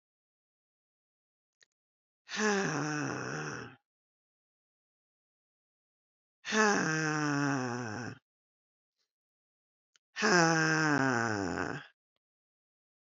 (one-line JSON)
{"exhalation_length": "13.1 s", "exhalation_amplitude": 10727, "exhalation_signal_mean_std_ratio": 0.41, "survey_phase": "beta (2021-08-13 to 2022-03-07)", "age": "45-64", "gender": "Female", "wearing_mask": "No", "symptom_cough_any": true, "symptom_new_continuous_cough": true, "symptom_runny_or_blocked_nose": true, "symptom_shortness_of_breath": true, "symptom_sore_throat": true, "symptom_diarrhoea": true, "symptom_fatigue": true, "symptom_fever_high_temperature": true, "symptom_headache": true, "symptom_onset": "3 days", "smoker_status": "Ex-smoker", "respiratory_condition_asthma": false, "respiratory_condition_other": false, "recruitment_source": "Test and Trace", "submission_delay": "1 day", "covid_test_result": "Positive", "covid_test_method": "RT-qPCR", "covid_ct_value": 21.9, "covid_ct_gene": "ORF1ab gene"}